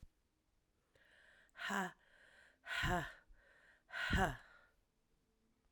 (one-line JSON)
{"exhalation_length": "5.7 s", "exhalation_amplitude": 2517, "exhalation_signal_mean_std_ratio": 0.38, "survey_phase": "alpha (2021-03-01 to 2021-08-12)", "age": "45-64", "gender": "Female", "wearing_mask": "No", "symptom_cough_any": true, "symptom_fatigue": true, "symptom_onset": "3 days", "smoker_status": "Never smoked", "respiratory_condition_asthma": false, "respiratory_condition_other": false, "recruitment_source": "Test and Trace", "submission_delay": "2 days", "covid_test_result": "Positive", "covid_test_method": "RT-qPCR"}